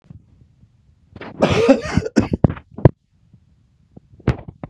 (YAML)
cough_length: 4.7 s
cough_amplitude: 32768
cough_signal_mean_std_ratio: 0.32
survey_phase: beta (2021-08-13 to 2022-03-07)
age: 65+
gender: Male
wearing_mask: 'No'
symptom_runny_or_blocked_nose: true
smoker_status: Ex-smoker
respiratory_condition_asthma: false
respiratory_condition_other: false
recruitment_source: Test and Trace
submission_delay: 2 days
covid_test_result: Positive
covid_test_method: LFT